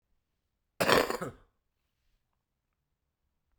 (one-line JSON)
{"cough_length": "3.6 s", "cough_amplitude": 15472, "cough_signal_mean_std_ratio": 0.24, "survey_phase": "beta (2021-08-13 to 2022-03-07)", "age": "45-64", "gender": "Male", "wearing_mask": "No", "symptom_cough_any": true, "symptom_runny_or_blocked_nose": true, "symptom_fatigue": true, "symptom_fever_high_temperature": true, "symptom_change_to_sense_of_smell_or_taste": true, "symptom_loss_of_taste": true, "symptom_onset": "5 days", "smoker_status": "Never smoked", "respiratory_condition_asthma": false, "respiratory_condition_other": false, "recruitment_source": "Test and Trace", "submission_delay": "2 days", "covid_test_result": "Positive", "covid_test_method": "RT-qPCR"}